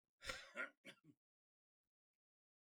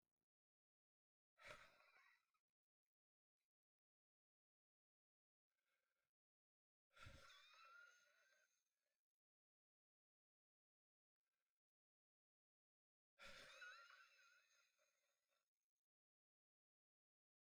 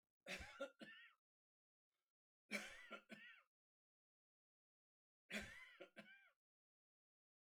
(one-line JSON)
{"cough_length": "2.6 s", "cough_amplitude": 1343, "cough_signal_mean_std_ratio": 0.3, "exhalation_length": "17.6 s", "exhalation_amplitude": 194, "exhalation_signal_mean_std_ratio": 0.32, "three_cough_length": "7.5 s", "three_cough_amplitude": 764, "three_cough_signal_mean_std_ratio": 0.36, "survey_phase": "beta (2021-08-13 to 2022-03-07)", "age": "45-64", "gender": "Male", "wearing_mask": "No", "symptom_none": true, "smoker_status": "Ex-smoker", "respiratory_condition_asthma": false, "respiratory_condition_other": true, "recruitment_source": "REACT", "submission_delay": "1 day", "covid_test_result": "Negative", "covid_test_method": "RT-qPCR"}